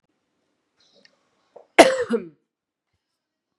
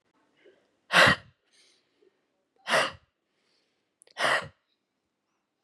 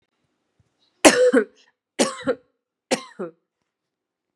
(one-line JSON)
{"cough_length": "3.6 s", "cough_amplitude": 32768, "cough_signal_mean_std_ratio": 0.2, "exhalation_length": "5.6 s", "exhalation_amplitude": 19632, "exhalation_signal_mean_std_ratio": 0.27, "three_cough_length": "4.4 s", "three_cough_amplitude": 32768, "three_cough_signal_mean_std_ratio": 0.3, "survey_phase": "beta (2021-08-13 to 2022-03-07)", "age": "18-44", "gender": "Female", "wearing_mask": "No", "symptom_cough_any": true, "symptom_runny_or_blocked_nose": true, "symptom_sore_throat": true, "symptom_fatigue": true, "symptom_headache": true, "symptom_change_to_sense_of_smell_or_taste": true, "symptom_onset": "3 days", "smoker_status": "Never smoked", "respiratory_condition_asthma": false, "respiratory_condition_other": false, "recruitment_source": "Test and Trace", "submission_delay": "2 days", "covid_test_result": "Positive", "covid_test_method": "RT-qPCR", "covid_ct_value": 17.2, "covid_ct_gene": "ORF1ab gene"}